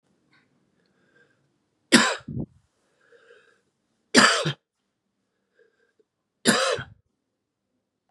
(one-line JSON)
{"three_cough_length": "8.1 s", "three_cough_amplitude": 29751, "three_cough_signal_mean_std_ratio": 0.26, "survey_phase": "beta (2021-08-13 to 2022-03-07)", "age": "45-64", "gender": "Male", "wearing_mask": "No", "symptom_cough_any": true, "symptom_runny_or_blocked_nose": true, "symptom_shortness_of_breath": true, "symptom_headache": true, "symptom_loss_of_taste": true, "smoker_status": "Never smoked", "respiratory_condition_asthma": false, "respiratory_condition_other": false, "recruitment_source": "Test and Trace", "submission_delay": "1 day", "covid_test_result": "Positive", "covid_test_method": "LFT"}